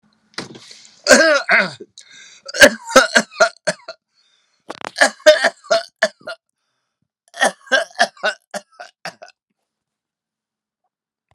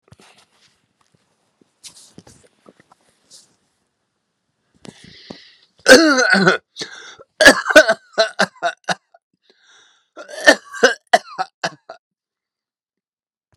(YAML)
three_cough_length: 11.3 s
three_cough_amplitude: 32768
three_cough_signal_mean_std_ratio: 0.32
cough_length: 13.6 s
cough_amplitude: 32768
cough_signal_mean_std_ratio: 0.27
survey_phase: beta (2021-08-13 to 2022-03-07)
age: 65+
gender: Male
wearing_mask: 'No'
symptom_none: true
smoker_status: Ex-smoker
respiratory_condition_asthma: false
respiratory_condition_other: false
recruitment_source: REACT
submission_delay: 1 day
covid_test_result: Negative
covid_test_method: RT-qPCR